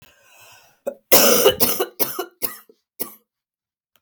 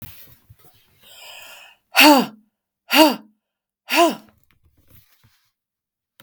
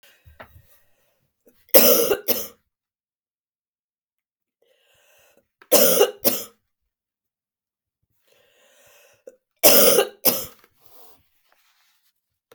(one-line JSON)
{"cough_length": "4.0 s", "cough_amplitude": 32768, "cough_signal_mean_std_ratio": 0.38, "exhalation_length": "6.2 s", "exhalation_amplitude": 32768, "exhalation_signal_mean_std_ratio": 0.29, "three_cough_length": "12.5 s", "three_cough_amplitude": 32768, "three_cough_signal_mean_std_ratio": 0.28, "survey_phase": "beta (2021-08-13 to 2022-03-07)", "age": "45-64", "gender": "Female", "wearing_mask": "No", "symptom_cough_any": true, "symptom_runny_or_blocked_nose": true, "symptom_sore_throat": true, "symptom_fatigue": true, "symptom_headache": true, "symptom_onset": "4 days", "smoker_status": "Ex-smoker", "respiratory_condition_asthma": false, "respiratory_condition_other": false, "recruitment_source": "Test and Trace", "submission_delay": "2 days", "covid_test_result": "Positive", "covid_test_method": "RT-qPCR", "covid_ct_value": 25.3, "covid_ct_gene": "ORF1ab gene", "covid_ct_mean": 25.6, "covid_viral_load": "4000 copies/ml", "covid_viral_load_category": "Minimal viral load (< 10K copies/ml)"}